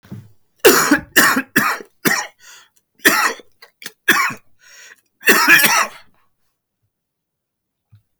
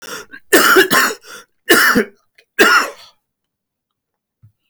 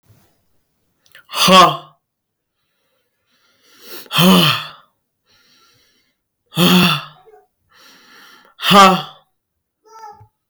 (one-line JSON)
{"cough_length": "8.2 s", "cough_amplitude": 32768, "cough_signal_mean_std_ratio": 0.41, "three_cough_length": "4.7 s", "three_cough_amplitude": 32768, "three_cough_signal_mean_std_ratio": 0.45, "exhalation_length": "10.5 s", "exhalation_amplitude": 32768, "exhalation_signal_mean_std_ratio": 0.33, "survey_phase": "alpha (2021-03-01 to 2021-08-12)", "age": "18-44", "gender": "Male", "wearing_mask": "No", "symptom_cough_any": true, "symptom_new_continuous_cough": true, "symptom_onset": "5 days", "smoker_status": "Never smoked", "respiratory_condition_asthma": false, "respiratory_condition_other": false, "recruitment_source": "REACT", "submission_delay": "1 day", "covid_test_result": "Negative", "covid_test_method": "RT-qPCR"}